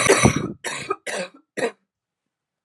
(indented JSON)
{
  "cough_length": "2.6 s",
  "cough_amplitude": 30616,
  "cough_signal_mean_std_ratio": 0.42,
  "survey_phase": "alpha (2021-03-01 to 2021-08-12)",
  "age": "45-64",
  "gender": "Female",
  "wearing_mask": "No",
  "symptom_cough_any": true,
  "symptom_shortness_of_breath": true,
  "symptom_fatigue": true,
  "symptom_onset": "8 days",
  "smoker_status": "Ex-smoker",
  "respiratory_condition_asthma": false,
  "respiratory_condition_other": false,
  "recruitment_source": "REACT",
  "submission_delay": "1 day",
  "covid_test_result": "Negative",
  "covid_test_method": "RT-qPCR"
}